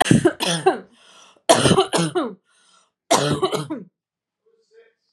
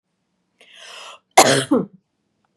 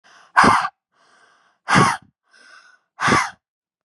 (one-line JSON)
{"three_cough_length": "5.1 s", "three_cough_amplitude": 32453, "three_cough_signal_mean_std_ratio": 0.45, "cough_length": "2.6 s", "cough_amplitude": 32768, "cough_signal_mean_std_ratio": 0.3, "exhalation_length": "3.8 s", "exhalation_amplitude": 32712, "exhalation_signal_mean_std_ratio": 0.38, "survey_phase": "beta (2021-08-13 to 2022-03-07)", "age": "18-44", "gender": "Female", "wearing_mask": "No", "symptom_none": true, "smoker_status": "Ex-smoker", "respiratory_condition_asthma": false, "respiratory_condition_other": false, "recruitment_source": "REACT", "submission_delay": "1 day", "covid_test_result": "Negative", "covid_test_method": "RT-qPCR", "influenza_a_test_result": "Negative", "influenza_b_test_result": "Negative"}